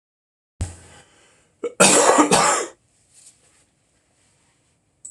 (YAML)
cough_length: 5.1 s
cough_amplitude: 26028
cough_signal_mean_std_ratio: 0.35
survey_phase: beta (2021-08-13 to 2022-03-07)
age: 18-44
gender: Male
wearing_mask: 'No'
symptom_cough_any: true
symptom_shortness_of_breath: true
symptom_sore_throat: true
symptom_fatigue: true
symptom_headache: true
symptom_change_to_sense_of_smell_or_taste: true
smoker_status: Never smoked
respiratory_condition_asthma: false
respiratory_condition_other: false
recruitment_source: Test and Trace
submission_delay: 2 days
covid_test_result: Positive
covid_test_method: RT-qPCR
covid_ct_value: 20.7
covid_ct_gene: ORF1ab gene
covid_ct_mean: 21.2
covid_viral_load: 110000 copies/ml
covid_viral_load_category: Low viral load (10K-1M copies/ml)